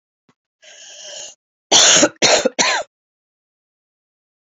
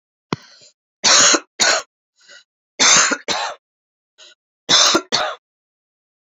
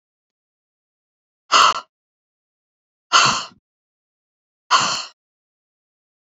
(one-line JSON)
{"cough_length": "4.4 s", "cough_amplitude": 32044, "cough_signal_mean_std_ratio": 0.37, "three_cough_length": "6.2 s", "three_cough_amplitude": 32767, "three_cough_signal_mean_std_ratio": 0.42, "exhalation_length": "6.3 s", "exhalation_amplitude": 29647, "exhalation_signal_mean_std_ratio": 0.27, "survey_phase": "beta (2021-08-13 to 2022-03-07)", "age": "18-44", "gender": "Female", "wearing_mask": "No", "symptom_cough_any": true, "symptom_runny_or_blocked_nose": true, "symptom_fever_high_temperature": true, "symptom_change_to_sense_of_smell_or_taste": true, "symptom_onset": "2 days", "smoker_status": "Never smoked", "respiratory_condition_asthma": false, "respiratory_condition_other": false, "recruitment_source": "Test and Trace", "submission_delay": "2 days", "covid_test_result": "Positive", "covid_test_method": "RT-qPCR", "covid_ct_value": 16.5, "covid_ct_gene": "ORF1ab gene", "covid_ct_mean": 17.0, "covid_viral_load": "2700000 copies/ml", "covid_viral_load_category": "High viral load (>1M copies/ml)"}